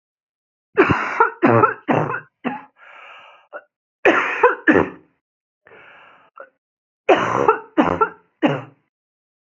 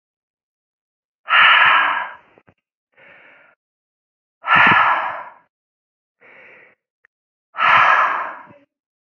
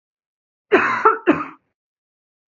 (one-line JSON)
{"three_cough_length": "9.6 s", "three_cough_amplitude": 32767, "three_cough_signal_mean_std_ratio": 0.41, "exhalation_length": "9.1 s", "exhalation_amplitude": 29350, "exhalation_signal_mean_std_ratio": 0.4, "cough_length": "2.5 s", "cough_amplitude": 29624, "cough_signal_mean_std_ratio": 0.37, "survey_phase": "beta (2021-08-13 to 2022-03-07)", "age": "18-44", "gender": "Female", "wearing_mask": "No", "symptom_cough_any": true, "symptom_new_continuous_cough": true, "symptom_runny_or_blocked_nose": true, "symptom_shortness_of_breath": true, "symptom_fatigue": true, "symptom_headache": true, "symptom_onset": "5 days", "smoker_status": "Never smoked", "respiratory_condition_asthma": false, "respiratory_condition_other": false, "recruitment_source": "Test and Trace", "submission_delay": "1 day", "covid_test_result": "Positive", "covid_test_method": "RT-qPCR", "covid_ct_value": 22.6, "covid_ct_gene": "ORF1ab gene"}